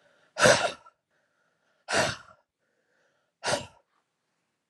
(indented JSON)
{
  "exhalation_length": "4.7 s",
  "exhalation_amplitude": 17236,
  "exhalation_signal_mean_std_ratio": 0.29,
  "survey_phase": "alpha (2021-03-01 to 2021-08-12)",
  "age": "45-64",
  "gender": "Female",
  "wearing_mask": "No",
  "symptom_cough_any": true,
  "symptom_shortness_of_breath": true,
  "symptom_fatigue": true,
  "symptom_onset": "8 days",
  "smoker_status": "Ex-smoker",
  "respiratory_condition_asthma": false,
  "respiratory_condition_other": false,
  "recruitment_source": "REACT",
  "submission_delay": "1 day",
  "covid_test_result": "Negative",
  "covid_test_method": "RT-qPCR"
}